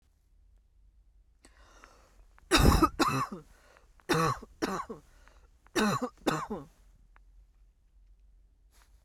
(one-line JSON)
{"three_cough_length": "9.0 s", "three_cough_amplitude": 12656, "three_cough_signal_mean_std_ratio": 0.36, "survey_phase": "beta (2021-08-13 to 2022-03-07)", "age": "45-64", "gender": "Female", "wearing_mask": "No", "symptom_cough_any": true, "symptom_runny_or_blocked_nose": true, "symptom_sore_throat": true, "symptom_fatigue": true, "symptom_fever_high_temperature": true, "symptom_onset": "3 days", "smoker_status": "Never smoked", "respiratory_condition_asthma": true, "respiratory_condition_other": false, "recruitment_source": "Test and Trace", "submission_delay": "2 days", "covid_test_result": "Positive", "covid_test_method": "RT-qPCR", "covid_ct_value": 21.5, "covid_ct_gene": "ORF1ab gene"}